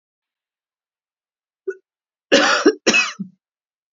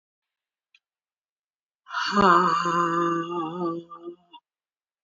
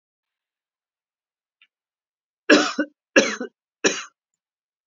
{
  "cough_length": "3.9 s",
  "cough_amplitude": 32768,
  "cough_signal_mean_std_ratio": 0.33,
  "exhalation_length": "5.0 s",
  "exhalation_amplitude": 20967,
  "exhalation_signal_mean_std_ratio": 0.47,
  "three_cough_length": "4.9 s",
  "three_cough_amplitude": 29940,
  "three_cough_signal_mean_std_ratio": 0.25,
  "survey_phase": "beta (2021-08-13 to 2022-03-07)",
  "age": "45-64",
  "gender": "Female",
  "wearing_mask": "No",
  "symptom_runny_or_blocked_nose": true,
  "symptom_sore_throat": true,
  "symptom_abdominal_pain": true,
  "symptom_fatigue": true,
  "symptom_headache": true,
  "smoker_status": "Ex-smoker",
  "respiratory_condition_asthma": false,
  "respiratory_condition_other": false,
  "recruitment_source": "Test and Trace",
  "submission_delay": "2 days",
  "covid_test_result": "Positive",
  "covid_test_method": "RT-qPCR",
  "covid_ct_value": 24.9,
  "covid_ct_gene": "ORF1ab gene"
}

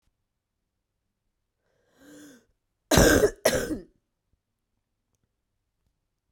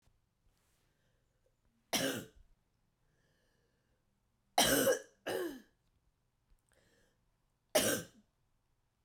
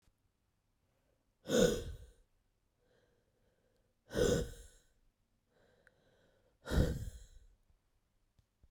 {
  "cough_length": "6.3 s",
  "cough_amplitude": 19322,
  "cough_signal_mean_std_ratio": 0.25,
  "three_cough_length": "9.0 s",
  "three_cough_amplitude": 5351,
  "three_cough_signal_mean_std_ratio": 0.29,
  "exhalation_length": "8.7 s",
  "exhalation_amplitude": 4759,
  "exhalation_signal_mean_std_ratio": 0.29,
  "survey_phase": "beta (2021-08-13 to 2022-03-07)",
  "age": "18-44",
  "gender": "Female",
  "wearing_mask": "No",
  "symptom_cough_any": true,
  "symptom_runny_or_blocked_nose": true,
  "symptom_sore_throat": true,
  "symptom_fever_high_temperature": true,
  "symptom_headache": true,
  "symptom_onset": "6 days",
  "smoker_status": "Never smoked",
  "respiratory_condition_asthma": false,
  "respiratory_condition_other": false,
  "recruitment_source": "Test and Trace",
  "submission_delay": "2 days",
  "covid_test_result": "Positive",
  "covid_test_method": "RT-qPCR",
  "covid_ct_value": 26.1,
  "covid_ct_gene": "ORF1ab gene",
  "covid_ct_mean": 26.1,
  "covid_viral_load": "2700 copies/ml",
  "covid_viral_load_category": "Minimal viral load (< 10K copies/ml)"
}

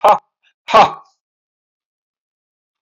{
  "exhalation_length": "2.8 s",
  "exhalation_amplitude": 28747,
  "exhalation_signal_mean_std_ratio": 0.27,
  "survey_phase": "beta (2021-08-13 to 2022-03-07)",
  "age": "65+",
  "gender": "Male",
  "wearing_mask": "No",
  "symptom_cough_any": true,
  "symptom_sore_throat": true,
  "symptom_fatigue": true,
  "symptom_fever_high_temperature": true,
  "symptom_headache": true,
  "symptom_onset": "3 days",
  "smoker_status": "Ex-smoker",
  "respiratory_condition_asthma": false,
  "respiratory_condition_other": false,
  "recruitment_source": "Test and Trace",
  "submission_delay": "2 days",
  "covid_test_result": "Positive",
  "covid_test_method": "RT-qPCR"
}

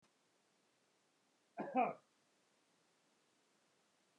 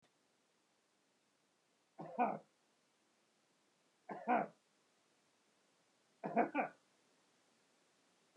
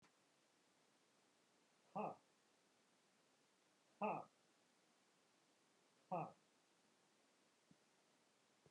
{
  "cough_length": "4.2 s",
  "cough_amplitude": 2026,
  "cough_signal_mean_std_ratio": 0.22,
  "three_cough_length": "8.4 s",
  "three_cough_amplitude": 2964,
  "three_cough_signal_mean_std_ratio": 0.26,
  "exhalation_length": "8.7 s",
  "exhalation_amplitude": 831,
  "exhalation_signal_mean_std_ratio": 0.26,
  "survey_phase": "beta (2021-08-13 to 2022-03-07)",
  "age": "45-64",
  "gender": "Male",
  "wearing_mask": "No",
  "symptom_none": true,
  "smoker_status": "Never smoked",
  "respiratory_condition_asthma": false,
  "respiratory_condition_other": false,
  "recruitment_source": "REACT",
  "submission_delay": "2 days",
  "covid_test_result": "Negative",
  "covid_test_method": "RT-qPCR"
}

